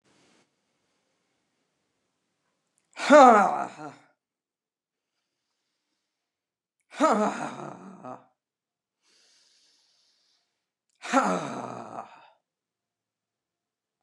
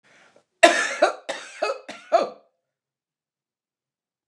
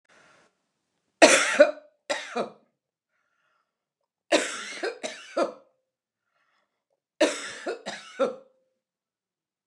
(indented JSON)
{
  "exhalation_length": "14.0 s",
  "exhalation_amplitude": 24464,
  "exhalation_signal_mean_std_ratio": 0.23,
  "cough_length": "4.3 s",
  "cough_amplitude": 29204,
  "cough_signal_mean_std_ratio": 0.3,
  "three_cough_length": "9.7 s",
  "three_cough_amplitude": 29203,
  "three_cough_signal_mean_std_ratio": 0.29,
  "survey_phase": "beta (2021-08-13 to 2022-03-07)",
  "age": "65+",
  "gender": "Female",
  "wearing_mask": "No",
  "symptom_none": true,
  "smoker_status": "Ex-smoker",
  "respiratory_condition_asthma": false,
  "respiratory_condition_other": false,
  "recruitment_source": "REACT",
  "submission_delay": "1 day",
  "covid_test_result": "Negative",
  "covid_test_method": "RT-qPCR",
  "influenza_a_test_result": "Negative",
  "influenza_b_test_result": "Negative"
}